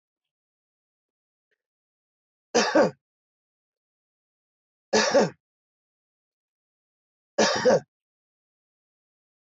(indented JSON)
{
  "three_cough_length": "9.6 s",
  "three_cough_amplitude": 12130,
  "three_cough_signal_mean_std_ratio": 0.26,
  "survey_phase": "beta (2021-08-13 to 2022-03-07)",
  "age": "45-64",
  "gender": "Male",
  "wearing_mask": "No",
  "symptom_none": true,
  "smoker_status": "Ex-smoker",
  "respiratory_condition_asthma": false,
  "respiratory_condition_other": false,
  "recruitment_source": "REACT",
  "submission_delay": "2 days",
  "covid_test_result": "Negative",
  "covid_test_method": "RT-qPCR",
  "influenza_a_test_result": "Unknown/Void",
  "influenza_b_test_result": "Unknown/Void"
}